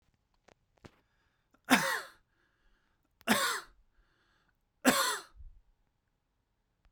{
  "three_cough_length": "6.9 s",
  "three_cough_amplitude": 12701,
  "three_cough_signal_mean_std_ratio": 0.29,
  "survey_phase": "beta (2021-08-13 to 2022-03-07)",
  "age": "18-44",
  "gender": "Male",
  "wearing_mask": "No",
  "symptom_none": true,
  "smoker_status": "Never smoked",
  "respiratory_condition_asthma": false,
  "respiratory_condition_other": false,
  "recruitment_source": "REACT",
  "submission_delay": "2 days",
  "covid_test_result": "Negative",
  "covid_test_method": "RT-qPCR"
}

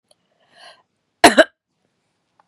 {
  "cough_length": "2.5 s",
  "cough_amplitude": 32768,
  "cough_signal_mean_std_ratio": 0.19,
  "survey_phase": "beta (2021-08-13 to 2022-03-07)",
  "age": "45-64",
  "gender": "Female",
  "wearing_mask": "No",
  "symptom_cough_any": true,
  "symptom_abdominal_pain": true,
  "symptom_headache": true,
  "symptom_onset": "12 days",
  "smoker_status": "Never smoked",
  "respiratory_condition_asthma": false,
  "respiratory_condition_other": false,
  "recruitment_source": "REACT",
  "submission_delay": "1 day",
  "covid_test_result": "Negative",
  "covid_test_method": "RT-qPCR",
  "influenza_a_test_result": "Negative",
  "influenza_b_test_result": "Negative"
}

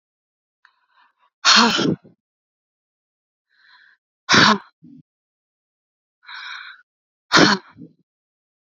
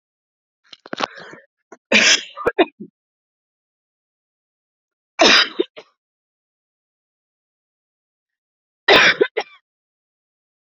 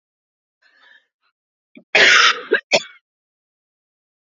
{
  "exhalation_length": "8.6 s",
  "exhalation_amplitude": 32768,
  "exhalation_signal_mean_std_ratio": 0.28,
  "three_cough_length": "10.8 s",
  "three_cough_amplitude": 31147,
  "three_cough_signal_mean_std_ratio": 0.26,
  "cough_length": "4.3 s",
  "cough_amplitude": 30271,
  "cough_signal_mean_std_ratio": 0.3,
  "survey_phase": "beta (2021-08-13 to 2022-03-07)",
  "age": "18-44",
  "gender": "Female",
  "wearing_mask": "No",
  "symptom_cough_any": true,
  "symptom_runny_or_blocked_nose": true,
  "symptom_shortness_of_breath": true,
  "symptom_sore_throat": true,
  "symptom_fatigue": true,
  "symptom_fever_high_temperature": true,
  "symptom_other": true,
  "symptom_onset": "4 days",
  "smoker_status": "Never smoked",
  "respiratory_condition_asthma": false,
  "respiratory_condition_other": false,
  "recruitment_source": "Test and Trace",
  "submission_delay": "1 day",
  "covid_test_result": "Positive",
  "covid_test_method": "ePCR"
}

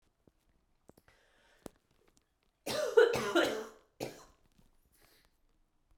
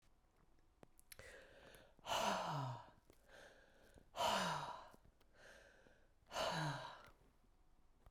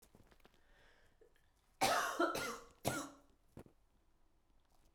{
  "three_cough_length": "6.0 s",
  "three_cough_amplitude": 8685,
  "three_cough_signal_mean_std_ratio": 0.29,
  "exhalation_length": "8.1 s",
  "exhalation_amplitude": 1462,
  "exhalation_signal_mean_std_ratio": 0.48,
  "cough_length": "4.9 s",
  "cough_amplitude": 3524,
  "cough_signal_mean_std_ratio": 0.37,
  "survey_phase": "beta (2021-08-13 to 2022-03-07)",
  "age": "18-44",
  "gender": "Female",
  "wearing_mask": "No",
  "symptom_cough_any": true,
  "symptom_runny_or_blocked_nose": true,
  "symptom_fatigue": true,
  "symptom_change_to_sense_of_smell_or_taste": true,
  "symptom_other": true,
  "symptom_onset": "3 days",
  "smoker_status": "Never smoked",
  "respiratory_condition_asthma": false,
  "respiratory_condition_other": false,
  "recruitment_source": "Test and Trace",
  "submission_delay": "2 days",
  "covid_test_result": "Positive",
  "covid_test_method": "RT-qPCR"
}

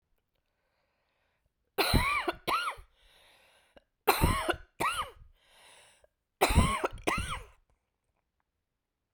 {
  "three_cough_length": "9.1 s",
  "three_cough_amplitude": 12235,
  "three_cough_signal_mean_std_ratio": 0.38,
  "survey_phase": "beta (2021-08-13 to 2022-03-07)",
  "age": "45-64",
  "gender": "Female",
  "wearing_mask": "No",
  "symptom_cough_any": true,
  "symptom_runny_or_blocked_nose": true,
  "symptom_sore_throat": true,
  "symptom_fatigue": true,
  "symptom_fever_high_temperature": true,
  "symptom_headache": true,
  "symptom_change_to_sense_of_smell_or_taste": true,
  "smoker_status": "Ex-smoker",
  "respiratory_condition_asthma": true,
  "respiratory_condition_other": false,
  "recruitment_source": "Test and Trace",
  "submission_delay": "1 day",
  "covid_test_result": "Positive",
  "covid_test_method": "ePCR"
}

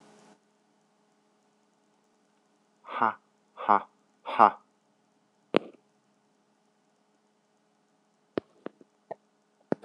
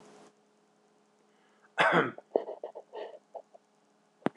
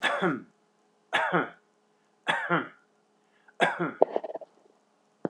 {
  "exhalation_length": "9.8 s",
  "exhalation_amplitude": 24281,
  "exhalation_signal_mean_std_ratio": 0.15,
  "cough_length": "4.4 s",
  "cough_amplitude": 11752,
  "cough_signal_mean_std_ratio": 0.29,
  "three_cough_length": "5.3 s",
  "three_cough_amplitude": 24885,
  "three_cough_signal_mean_std_ratio": 0.4,
  "survey_phase": "beta (2021-08-13 to 2022-03-07)",
  "age": "45-64",
  "gender": "Male",
  "wearing_mask": "No",
  "symptom_none": true,
  "smoker_status": "Never smoked",
  "respiratory_condition_asthma": false,
  "respiratory_condition_other": false,
  "recruitment_source": "REACT",
  "submission_delay": "3 days",
  "covid_test_result": "Negative",
  "covid_test_method": "RT-qPCR",
  "influenza_a_test_result": "Negative",
  "influenza_b_test_result": "Negative"
}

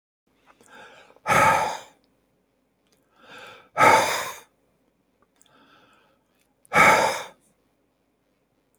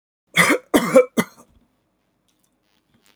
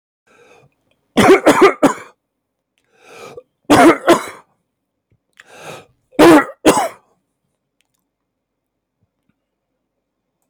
{
  "exhalation_length": "8.8 s",
  "exhalation_amplitude": 24615,
  "exhalation_signal_mean_std_ratio": 0.32,
  "cough_length": "3.2 s",
  "cough_amplitude": 29535,
  "cough_signal_mean_std_ratio": 0.32,
  "three_cough_length": "10.5 s",
  "three_cough_amplitude": 32767,
  "three_cough_signal_mean_std_ratio": 0.32,
  "survey_phase": "beta (2021-08-13 to 2022-03-07)",
  "age": "65+",
  "gender": "Male",
  "wearing_mask": "No",
  "symptom_change_to_sense_of_smell_or_taste": true,
  "smoker_status": "Never smoked",
  "respiratory_condition_asthma": false,
  "respiratory_condition_other": false,
  "recruitment_source": "REACT",
  "submission_delay": "1 day",
  "covid_test_result": "Negative",
  "covid_test_method": "RT-qPCR",
  "influenza_a_test_result": "Negative",
  "influenza_b_test_result": "Negative"
}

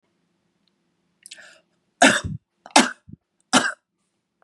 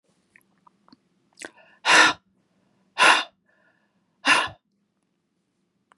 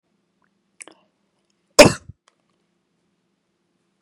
{
  "three_cough_length": "4.4 s",
  "three_cough_amplitude": 32629,
  "three_cough_signal_mean_std_ratio": 0.25,
  "exhalation_length": "6.0 s",
  "exhalation_amplitude": 26391,
  "exhalation_signal_mean_std_ratio": 0.27,
  "cough_length": "4.0 s",
  "cough_amplitude": 32768,
  "cough_signal_mean_std_ratio": 0.13,
  "survey_phase": "beta (2021-08-13 to 2022-03-07)",
  "age": "18-44",
  "gender": "Female",
  "wearing_mask": "No",
  "symptom_none": true,
  "smoker_status": "Never smoked",
  "respiratory_condition_asthma": false,
  "respiratory_condition_other": false,
  "recruitment_source": "REACT",
  "submission_delay": "1 day",
  "covid_test_result": "Negative",
  "covid_test_method": "RT-qPCR",
  "influenza_a_test_result": "Negative",
  "influenza_b_test_result": "Negative"
}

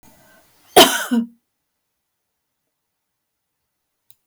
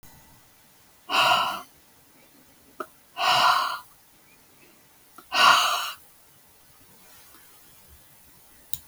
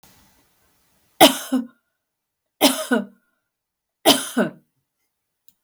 {
  "cough_length": "4.3 s",
  "cough_amplitude": 32768,
  "cough_signal_mean_std_ratio": 0.22,
  "exhalation_length": "8.9 s",
  "exhalation_amplitude": 28703,
  "exhalation_signal_mean_std_ratio": 0.37,
  "three_cough_length": "5.6 s",
  "three_cough_amplitude": 32768,
  "three_cough_signal_mean_std_ratio": 0.29,
  "survey_phase": "beta (2021-08-13 to 2022-03-07)",
  "age": "65+",
  "gender": "Female",
  "wearing_mask": "No",
  "symptom_none": true,
  "smoker_status": "Ex-smoker",
  "respiratory_condition_asthma": false,
  "respiratory_condition_other": false,
  "recruitment_source": "REACT",
  "submission_delay": "2 days",
  "covid_test_result": "Negative",
  "covid_test_method": "RT-qPCR",
  "influenza_a_test_result": "Negative",
  "influenza_b_test_result": "Negative"
}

